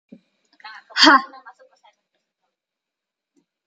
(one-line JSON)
{"exhalation_length": "3.7 s", "exhalation_amplitude": 32768, "exhalation_signal_mean_std_ratio": 0.22, "survey_phase": "alpha (2021-03-01 to 2021-08-12)", "age": "18-44", "gender": "Female", "wearing_mask": "No", "symptom_none": true, "smoker_status": "Never smoked", "respiratory_condition_asthma": false, "respiratory_condition_other": false, "recruitment_source": "REACT", "submission_delay": "6 days", "covid_test_result": "Negative", "covid_test_method": "RT-qPCR"}